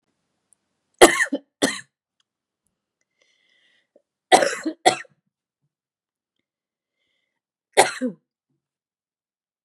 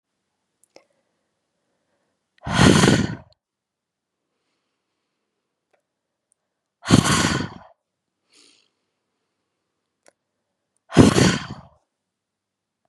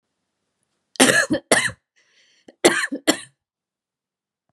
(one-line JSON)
{"three_cough_length": "9.6 s", "three_cough_amplitude": 32768, "three_cough_signal_mean_std_ratio": 0.21, "exhalation_length": "12.9 s", "exhalation_amplitude": 32768, "exhalation_signal_mean_std_ratio": 0.26, "cough_length": "4.5 s", "cough_amplitude": 32542, "cough_signal_mean_std_ratio": 0.32, "survey_phase": "beta (2021-08-13 to 2022-03-07)", "age": "18-44", "gender": "Female", "wearing_mask": "No", "symptom_runny_or_blocked_nose": true, "symptom_fatigue": true, "symptom_headache": true, "symptom_change_to_sense_of_smell_or_taste": true, "symptom_loss_of_taste": true, "symptom_onset": "4 days", "smoker_status": "Never smoked", "respiratory_condition_asthma": false, "respiratory_condition_other": false, "recruitment_source": "Test and Trace", "submission_delay": "1 day", "covid_test_result": "Positive", "covid_test_method": "ePCR"}